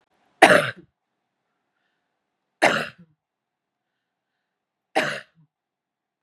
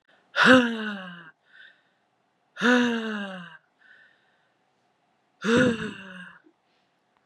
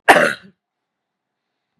{
  "three_cough_length": "6.2 s",
  "three_cough_amplitude": 32768,
  "three_cough_signal_mean_std_ratio": 0.22,
  "exhalation_length": "7.3 s",
  "exhalation_amplitude": 26752,
  "exhalation_signal_mean_std_ratio": 0.36,
  "cough_length": "1.8 s",
  "cough_amplitude": 32768,
  "cough_signal_mean_std_ratio": 0.27,
  "survey_phase": "beta (2021-08-13 to 2022-03-07)",
  "age": "45-64",
  "gender": "Female",
  "wearing_mask": "No",
  "symptom_cough_any": true,
  "symptom_sore_throat": true,
  "symptom_onset": "4 days",
  "smoker_status": "Never smoked",
  "respiratory_condition_asthma": false,
  "respiratory_condition_other": false,
  "recruitment_source": "REACT",
  "submission_delay": "1 day",
  "covid_test_result": "Negative",
  "covid_test_method": "RT-qPCR",
  "influenza_a_test_result": "Unknown/Void",
  "influenza_b_test_result": "Unknown/Void"
}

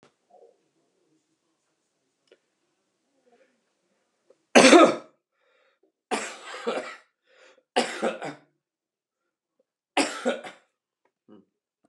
{
  "three_cough_length": "11.9 s",
  "three_cough_amplitude": 31216,
  "three_cough_signal_mean_std_ratio": 0.22,
  "survey_phase": "beta (2021-08-13 to 2022-03-07)",
  "age": "65+",
  "gender": "Male",
  "wearing_mask": "No",
  "symptom_cough_any": true,
  "symptom_runny_or_blocked_nose": true,
  "symptom_fatigue": true,
  "smoker_status": "Never smoked",
  "respiratory_condition_asthma": false,
  "respiratory_condition_other": false,
  "recruitment_source": "Test and Trace",
  "submission_delay": "2 days",
  "covid_test_result": "Positive",
  "covid_test_method": "ePCR"
}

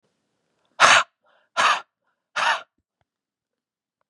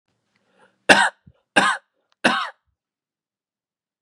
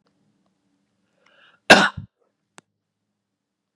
{
  "exhalation_length": "4.1 s",
  "exhalation_amplitude": 32767,
  "exhalation_signal_mean_std_ratio": 0.3,
  "three_cough_length": "4.0 s",
  "three_cough_amplitude": 32768,
  "three_cough_signal_mean_std_ratio": 0.28,
  "cough_length": "3.8 s",
  "cough_amplitude": 32768,
  "cough_signal_mean_std_ratio": 0.16,
  "survey_phase": "beta (2021-08-13 to 2022-03-07)",
  "age": "18-44",
  "gender": "Male",
  "wearing_mask": "No",
  "symptom_none": true,
  "smoker_status": "Never smoked",
  "respiratory_condition_asthma": false,
  "respiratory_condition_other": false,
  "recruitment_source": "REACT",
  "submission_delay": "1 day",
  "covid_test_result": "Negative",
  "covid_test_method": "RT-qPCR",
  "influenza_a_test_result": "Negative",
  "influenza_b_test_result": "Negative"
}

